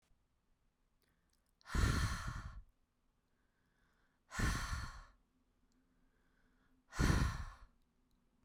{
  "exhalation_length": "8.4 s",
  "exhalation_amplitude": 3159,
  "exhalation_signal_mean_std_ratio": 0.37,
  "survey_phase": "beta (2021-08-13 to 2022-03-07)",
  "age": "18-44",
  "gender": "Female",
  "wearing_mask": "No",
  "symptom_cough_any": true,
  "symptom_runny_or_blocked_nose": true,
  "symptom_fatigue": true,
  "symptom_onset": "8 days",
  "smoker_status": "Prefer not to say",
  "respiratory_condition_asthma": false,
  "respiratory_condition_other": false,
  "recruitment_source": "REACT",
  "submission_delay": "1 day",
  "covid_test_result": "Negative",
  "covid_test_method": "RT-qPCR"
}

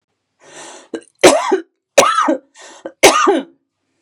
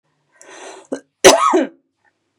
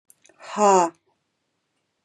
{
  "three_cough_length": "4.0 s",
  "three_cough_amplitude": 32768,
  "three_cough_signal_mean_std_ratio": 0.43,
  "cough_length": "2.4 s",
  "cough_amplitude": 32768,
  "cough_signal_mean_std_ratio": 0.34,
  "exhalation_length": "2.0 s",
  "exhalation_amplitude": 20307,
  "exhalation_signal_mean_std_ratio": 0.33,
  "survey_phase": "beta (2021-08-13 to 2022-03-07)",
  "age": "45-64",
  "gender": "Female",
  "wearing_mask": "No",
  "symptom_diarrhoea": true,
  "symptom_fatigue": true,
  "symptom_change_to_sense_of_smell_or_taste": true,
  "symptom_loss_of_taste": true,
  "symptom_onset": "7 days",
  "smoker_status": "Ex-smoker",
  "respiratory_condition_asthma": false,
  "respiratory_condition_other": false,
  "recruitment_source": "REACT",
  "submission_delay": "1 day",
  "covid_test_result": "Negative",
  "covid_test_method": "RT-qPCR",
  "influenza_a_test_result": "Negative",
  "influenza_b_test_result": "Negative"
}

